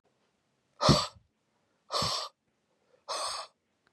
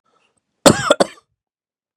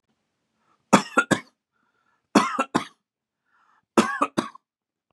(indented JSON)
{
  "exhalation_length": "3.9 s",
  "exhalation_amplitude": 13602,
  "exhalation_signal_mean_std_ratio": 0.33,
  "cough_length": "2.0 s",
  "cough_amplitude": 32768,
  "cough_signal_mean_std_ratio": 0.26,
  "three_cough_length": "5.1 s",
  "three_cough_amplitude": 30297,
  "three_cough_signal_mean_std_ratio": 0.28,
  "survey_phase": "beta (2021-08-13 to 2022-03-07)",
  "age": "18-44",
  "gender": "Male",
  "wearing_mask": "No",
  "symptom_none": true,
  "smoker_status": "Never smoked",
  "respiratory_condition_asthma": false,
  "respiratory_condition_other": false,
  "recruitment_source": "REACT",
  "submission_delay": "2 days",
  "covid_test_result": "Negative",
  "covid_test_method": "RT-qPCR",
  "influenza_a_test_result": "Negative",
  "influenza_b_test_result": "Negative"
}